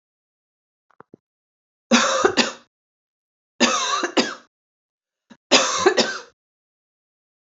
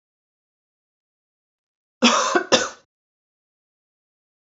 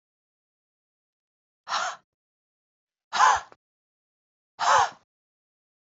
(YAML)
three_cough_length: 7.5 s
three_cough_amplitude: 28755
three_cough_signal_mean_std_ratio: 0.36
cough_length: 4.5 s
cough_amplitude: 27918
cough_signal_mean_std_ratio: 0.26
exhalation_length: 5.9 s
exhalation_amplitude: 16575
exhalation_signal_mean_std_ratio: 0.27
survey_phase: beta (2021-08-13 to 2022-03-07)
age: 18-44
gender: Female
wearing_mask: 'No'
symptom_runny_or_blocked_nose: true
symptom_sore_throat: true
symptom_fatigue: true
smoker_status: Never smoked
respiratory_condition_asthma: false
respiratory_condition_other: false
recruitment_source: REACT
submission_delay: 3 days
covid_test_result: Negative
covid_test_method: RT-qPCR
influenza_a_test_result: Negative
influenza_b_test_result: Negative